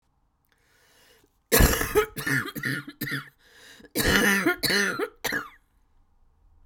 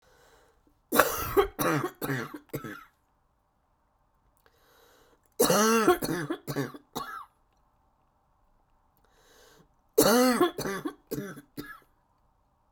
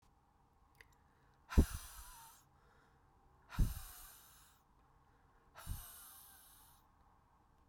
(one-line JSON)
{"cough_length": "6.7 s", "cough_amplitude": 19587, "cough_signal_mean_std_ratio": 0.48, "three_cough_length": "12.7 s", "three_cough_amplitude": 29442, "three_cough_signal_mean_std_ratio": 0.38, "exhalation_length": "7.7 s", "exhalation_amplitude": 4808, "exhalation_signal_mean_std_ratio": 0.23, "survey_phase": "beta (2021-08-13 to 2022-03-07)", "age": "45-64", "gender": "Female", "wearing_mask": "No", "symptom_cough_any": true, "symptom_runny_or_blocked_nose": true, "symptom_headache": true, "symptom_onset": "10 days", "smoker_status": "Ex-smoker", "respiratory_condition_asthma": false, "respiratory_condition_other": false, "recruitment_source": "REACT", "submission_delay": "2 days", "covid_test_result": "Negative", "covid_test_method": "RT-qPCR", "influenza_a_test_result": "Unknown/Void", "influenza_b_test_result": "Unknown/Void"}